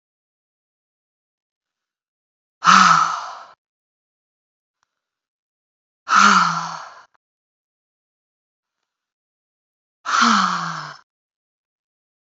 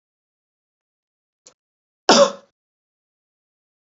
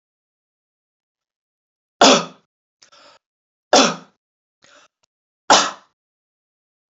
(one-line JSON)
{"exhalation_length": "12.3 s", "exhalation_amplitude": 32768, "exhalation_signal_mean_std_ratio": 0.29, "cough_length": "3.8 s", "cough_amplitude": 32767, "cough_signal_mean_std_ratio": 0.18, "three_cough_length": "6.9 s", "three_cough_amplitude": 32768, "three_cough_signal_mean_std_ratio": 0.23, "survey_phase": "alpha (2021-03-01 to 2021-08-12)", "age": "18-44", "gender": "Female", "wearing_mask": "No", "symptom_none": true, "smoker_status": "Never smoked", "respiratory_condition_asthma": false, "respiratory_condition_other": false, "recruitment_source": "REACT", "submission_delay": "1 day", "covid_test_result": "Negative", "covid_test_method": "RT-qPCR"}